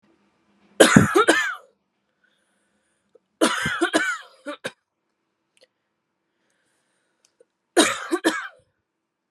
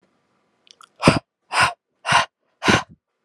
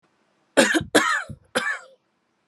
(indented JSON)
{
  "three_cough_length": "9.3 s",
  "three_cough_amplitude": 32768,
  "three_cough_signal_mean_std_ratio": 0.31,
  "exhalation_length": "3.2 s",
  "exhalation_amplitude": 32768,
  "exhalation_signal_mean_std_ratio": 0.35,
  "cough_length": "2.5 s",
  "cough_amplitude": 29082,
  "cough_signal_mean_std_ratio": 0.42,
  "survey_phase": "alpha (2021-03-01 to 2021-08-12)",
  "age": "18-44",
  "gender": "Female",
  "wearing_mask": "No",
  "symptom_headache": true,
  "smoker_status": "Never smoked",
  "respiratory_condition_asthma": false,
  "respiratory_condition_other": false,
  "recruitment_source": "REACT",
  "submission_delay": "1 day",
  "covid_test_result": "Negative",
  "covid_test_method": "RT-qPCR"
}